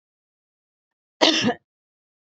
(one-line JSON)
{"cough_length": "2.3 s", "cough_amplitude": 26549, "cough_signal_mean_std_ratio": 0.28, "survey_phase": "beta (2021-08-13 to 2022-03-07)", "age": "45-64", "gender": "Female", "wearing_mask": "No", "symptom_headache": true, "smoker_status": "Ex-smoker", "respiratory_condition_asthma": false, "respiratory_condition_other": false, "recruitment_source": "REACT", "submission_delay": "3 days", "covid_test_result": "Negative", "covid_test_method": "RT-qPCR", "influenza_a_test_result": "Negative", "influenza_b_test_result": "Negative"}